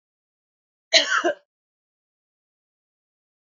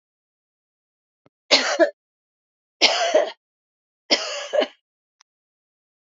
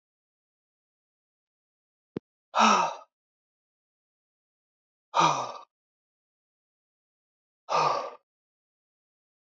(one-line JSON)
{"cough_length": "3.6 s", "cough_amplitude": 29267, "cough_signal_mean_std_ratio": 0.23, "three_cough_length": "6.1 s", "three_cough_amplitude": 28533, "three_cough_signal_mean_std_ratio": 0.33, "exhalation_length": "9.6 s", "exhalation_amplitude": 13534, "exhalation_signal_mean_std_ratio": 0.26, "survey_phase": "alpha (2021-03-01 to 2021-08-12)", "age": "45-64", "gender": "Female", "wearing_mask": "No", "symptom_none": true, "smoker_status": "Ex-smoker", "respiratory_condition_asthma": false, "respiratory_condition_other": false, "recruitment_source": "REACT", "submission_delay": "2 days", "covid_test_result": "Negative", "covid_test_method": "RT-qPCR"}